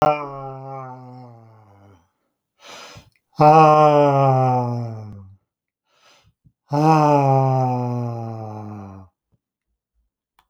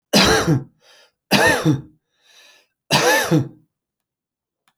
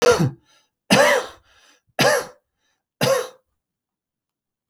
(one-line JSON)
{"exhalation_length": "10.5 s", "exhalation_amplitude": 29398, "exhalation_signal_mean_std_ratio": 0.48, "three_cough_length": "4.8 s", "three_cough_amplitude": 29966, "three_cough_signal_mean_std_ratio": 0.47, "cough_length": "4.7 s", "cough_amplitude": 26304, "cough_signal_mean_std_ratio": 0.4, "survey_phase": "alpha (2021-03-01 to 2021-08-12)", "age": "45-64", "gender": "Male", "wearing_mask": "No", "symptom_none": true, "smoker_status": "Never smoked", "respiratory_condition_asthma": true, "respiratory_condition_other": false, "recruitment_source": "REACT", "submission_delay": "1 day", "covid_test_result": "Negative", "covid_test_method": "RT-qPCR"}